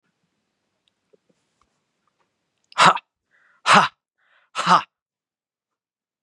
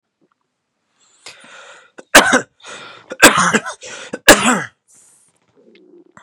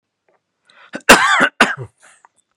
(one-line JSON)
{"exhalation_length": "6.2 s", "exhalation_amplitude": 32504, "exhalation_signal_mean_std_ratio": 0.23, "three_cough_length": "6.2 s", "three_cough_amplitude": 32768, "three_cough_signal_mean_std_ratio": 0.31, "cough_length": "2.6 s", "cough_amplitude": 32768, "cough_signal_mean_std_ratio": 0.35, "survey_phase": "beta (2021-08-13 to 2022-03-07)", "age": "65+", "gender": "Male", "wearing_mask": "No", "symptom_fatigue": true, "smoker_status": "Ex-smoker", "respiratory_condition_asthma": false, "respiratory_condition_other": false, "recruitment_source": "REACT", "submission_delay": "0 days", "covid_test_result": "Negative", "covid_test_method": "RT-qPCR", "influenza_a_test_result": "Negative", "influenza_b_test_result": "Negative"}